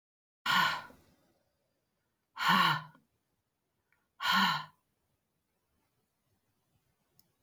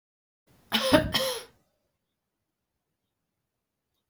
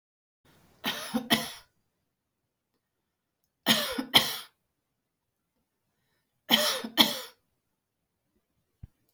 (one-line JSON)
{"exhalation_length": "7.4 s", "exhalation_amplitude": 7192, "exhalation_signal_mean_std_ratio": 0.32, "cough_length": "4.1 s", "cough_amplitude": 18744, "cough_signal_mean_std_ratio": 0.28, "three_cough_length": "9.1 s", "three_cough_amplitude": 20523, "three_cough_signal_mean_std_ratio": 0.28, "survey_phase": "alpha (2021-03-01 to 2021-08-12)", "age": "45-64", "gender": "Female", "wearing_mask": "No", "symptom_none": true, "smoker_status": "Never smoked", "respiratory_condition_asthma": false, "respiratory_condition_other": false, "recruitment_source": "REACT", "submission_delay": "3 days", "covid_test_result": "Negative", "covid_test_method": "RT-qPCR"}